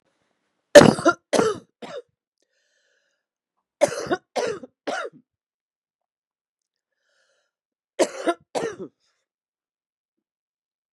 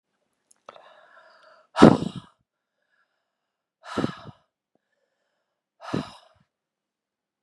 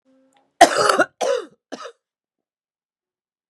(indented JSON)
{
  "three_cough_length": "10.9 s",
  "three_cough_amplitude": 32768,
  "three_cough_signal_mean_std_ratio": 0.22,
  "exhalation_length": "7.4 s",
  "exhalation_amplitude": 32768,
  "exhalation_signal_mean_std_ratio": 0.16,
  "cough_length": "3.5 s",
  "cough_amplitude": 32768,
  "cough_signal_mean_std_ratio": 0.29,
  "survey_phase": "beta (2021-08-13 to 2022-03-07)",
  "age": "45-64",
  "gender": "Female",
  "wearing_mask": "No",
  "symptom_runny_or_blocked_nose": true,
  "symptom_abdominal_pain": true,
  "smoker_status": "Current smoker (11 or more cigarettes per day)",
  "respiratory_condition_asthma": false,
  "respiratory_condition_other": false,
  "recruitment_source": "Test and Trace",
  "submission_delay": "-1 day",
  "covid_test_result": "Negative",
  "covid_test_method": "LFT"
}